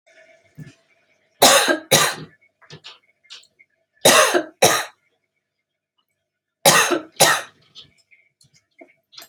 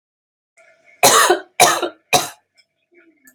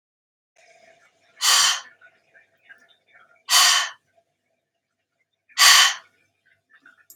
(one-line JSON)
{"three_cough_length": "9.3 s", "three_cough_amplitude": 32768, "three_cough_signal_mean_std_ratio": 0.34, "cough_length": "3.3 s", "cough_amplitude": 32768, "cough_signal_mean_std_ratio": 0.37, "exhalation_length": "7.2 s", "exhalation_amplitude": 32316, "exhalation_signal_mean_std_ratio": 0.31, "survey_phase": "alpha (2021-03-01 to 2021-08-12)", "age": "45-64", "gender": "Female", "wearing_mask": "No", "symptom_cough_any": true, "symptom_fatigue": true, "symptom_headache": true, "symptom_onset": "12 days", "smoker_status": "Never smoked", "respiratory_condition_asthma": false, "respiratory_condition_other": false, "recruitment_source": "REACT", "submission_delay": "2 days", "covid_test_result": "Negative", "covid_test_method": "RT-qPCR"}